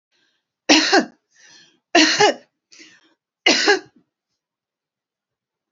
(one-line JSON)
{"three_cough_length": "5.7 s", "three_cough_amplitude": 32768, "three_cough_signal_mean_std_ratio": 0.34, "survey_phase": "alpha (2021-03-01 to 2021-08-12)", "age": "45-64", "gender": "Female", "wearing_mask": "No", "symptom_none": true, "smoker_status": "Never smoked", "respiratory_condition_asthma": false, "respiratory_condition_other": false, "recruitment_source": "REACT", "submission_delay": "2 days", "covid_test_result": "Negative", "covid_test_method": "RT-qPCR"}